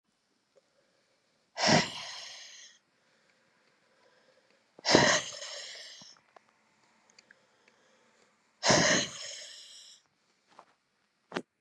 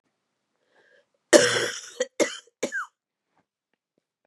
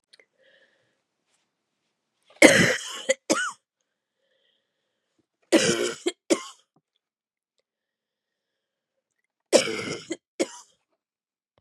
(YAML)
exhalation_length: 11.6 s
exhalation_amplitude: 22640
exhalation_signal_mean_std_ratio: 0.3
cough_length: 4.3 s
cough_amplitude: 31999
cough_signal_mean_std_ratio: 0.27
three_cough_length: 11.6 s
three_cough_amplitude: 32767
three_cough_signal_mean_std_ratio: 0.26
survey_phase: beta (2021-08-13 to 2022-03-07)
age: 45-64
gender: Female
wearing_mask: 'No'
symptom_cough_any: true
symptom_runny_or_blocked_nose: true
symptom_sore_throat: true
symptom_fatigue: true
symptom_headache: true
symptom_onset: 5 days
smoker_status: Never smoked
respiratory_condition_asthma: false
respiratory_condition_other: false
recruitment_source: Test and Trace
submission_delay: 2 days
covid_test_result: Positive
covid_test_method: RT-qPCR
covid_ct_value: 21.2
covid_ct_gene: ORF1ab gene
covid_ct_mean: 22.2
covid_viral_load: 51000 copies/ml
covid_viral_load_category: Low viral load (10K-1M copies/ml)